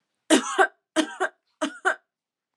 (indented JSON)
{
  "three_cough_length": "2.6 s",
  "three_cough_amplitude": 24659,
  "three_cough_signal_mean_std_ratio": 0.38,
  "survey_phase": "alpha (2021-03-01 to 2021-08-12)",
  "age": "18-44",
  "gender": "Female",
  "wearing_mask": "No",
  "symptom_fatigue": true,
  "symptom_headache": true,
  "symptom_onset": "3 days",
  "smoker_status": "Never smoked",
  "respiratory_condition_asthma": false,
  "respiratory_condition_other": false,
  "recruitment_source": "Test and Trace",
  "submission_delay": "1 day",
  "covid_test_result": "Positive",
  "covid_test_method": "RT-qPCR",
  "covid_ct_value": 13.9,
  "covid_ct_gene": "ORF1ab gene",
  "covid_ct_mean": 14.1,
  "covid_viral_load": "23000000 copies/ml",
  "covid_viral_load_category": "High viral load (>1M copies/ml)"
}